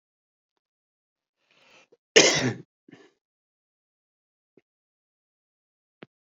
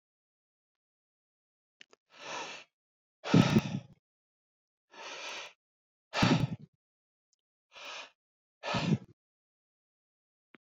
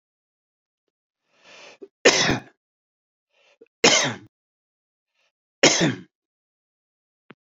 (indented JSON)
{
  "cough_length": "6.2 s",
  "cough_amplitude": 29528,
  "cough_signal_mean_std_ratio": 0.17,
  "exhalation_length": "10.8 s",
  "exhalation_amplitude": 10550,
  "exhalation_signal_mean_std_ratio": 0.27,
  "three_cough_length": "7.4 s",
  "three_cough_amplitude": 31554,
  "three_cough_signal_mean_std_ratio": 0.27,
  "survey_phase": "beta (2021-08-13 to 2022-03-07)",
  "age": "45-64",
  "gender": "Male",
  "wearing_mask": "No",
  "symptom_cough_any": true,
  "symptom_runny_or_blocked_nose": true,
  "smoker_status": "Ex-smoker",
  "respiratory_condition_asthma": false,
  "respiratory_condition_other": false,
  "recruitment_source": "REACT",
  "submission_delay": "2 days",
  "covid_test_result": "Negative",
  "covid_test_method": "RT-qPCR"
}